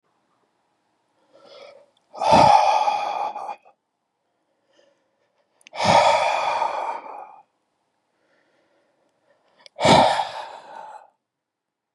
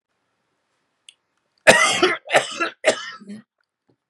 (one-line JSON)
{"exhalation_length": "11.9 s", "exhalation_amplitude": 25905, "exhalation_signal_mean_std_ratio": 0.38, "cough_length": "4.1 s", "cough_amplitude": 32768, "cough_signal_mean_std_ratio": 0.35, "survey_phase": "beta (2021-08-13 to 2022-03-07)", "age": "18-44", "gender": "Male", "wearing_mask": "No", "symptom_cough_any": true, "symptom_runny_or_blocked_nose": true, "symptom_sore_throat": true, "symptom_fatigue": true, "symptom_headache": true, "smoker_status": "Never smoked", "respiratory_condition_asthma": false, "respiratory_condition_other": false, "recruitment_source": "Test and Trace", "submission_delay": "2 days", "covid_test_result": "Positive", "covid_test_method": "RT-qPCR", "covid_ct_value": 32.5, "covid_ct_gene": "ORF1ab gene"}